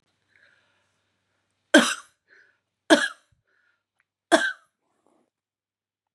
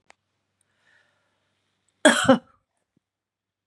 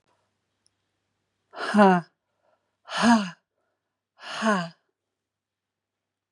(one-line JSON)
{"three_cough_length": "6.1 s", "three_cough_amplitude": 29890, "three_cough_signal_mean_std_ratio": 0.21, "cough_length": "3.7 s", "cough_amplitude": 27395, "cough_signal_mean_std_ratio": 0.21, "exhalation_length": "6.3 s", "exhalation_amplitude": 21236, "exhalation_signal_mean_std_ratio": 0.29, "survey_phase": "beta (2021-08-13 to 2022-03-07)", "age": "45-64", "gender": "Female", "wearing_mask": "No", "symptom_change_to_sense_of_smell_or_taste": true, "smoker_status": "Never smoked", "respiratory_condition_asthma": false, "respiratory_condition_other": false, "recruitment_source": "Test and Trace", "submission_delay": "2 days", "covid_test_result": "Positive", "covid_test_method": "RT-qPCR", "covid_ct_value": 34.3, "covid_ct_gene": "ORF1ab gene"}